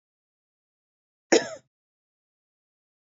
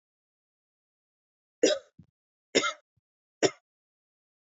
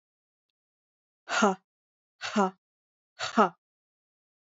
{"cough_length": "3.1 s", "cough_amplitude": 19870, "cough_signal_mean_std_ratio": 0.15, "three_cough_length": "4.4 s", "three_cough_amplitude": 11917, "three_cough_signal_mean_std_ratio": 0.21, "exhalation_length": "4.5 s", "exhalation_amplitude": 14948, "exhalation_signal_mean_std_ratio": 0.26, "survey_phase": "beta (2021-08-13 to 2022-03-07)", "age": "18-44", "gender": "Female", "wearing_mask": "No", "symptom_runny_or_blocked_nose": true, "smoker_status": "Never smoked", "respiratory_condition_asthma": false, "respiratory_condition_other": false, "recruitment_source": "Test and Trace", "submission_delay": "1 day", "covid_test_result": "Positive", "covid_test_method": "LFT"}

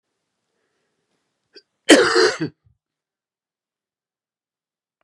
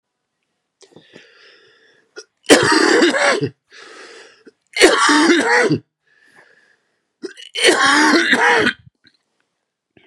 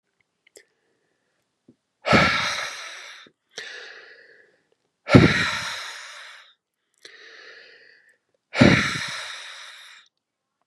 {"cough_length": "5.0 s", "cough_amplitude": 32768, "cough_signal_mean_std_ratio": 0.23, "three_cough_length": "10.1 s", "three_cough_amplitude": 32768, "three_cough_signal_mean_std_ratio": 0.48, "exhalation_length": "10.7 s", "exhalation_amplitude": 32767, "exhalation_signal_mean_std_ratio": 0.32, "survey_phase": "beta (2021-08-13 to 2022-03-07)", "age": "65+", "gender": "Male", "wearing_mask": "No", "symptom_cough_any": true, "symptom_new_continuous_cough": true, "symptom_runny_or_blocked_nose": true, "symptom_fatigue": true, "symptom_change_to_sense_of_smell_or_taste": true, "smoker_status": "Never smoked", "respiratory_condition_asthma": false, "respiratory_condition_other": false, "recruitment_source": "Test and Trace", "submission_delay": "1 day", "covid_test_result": "Positive", "covid_test_method": "LFT"}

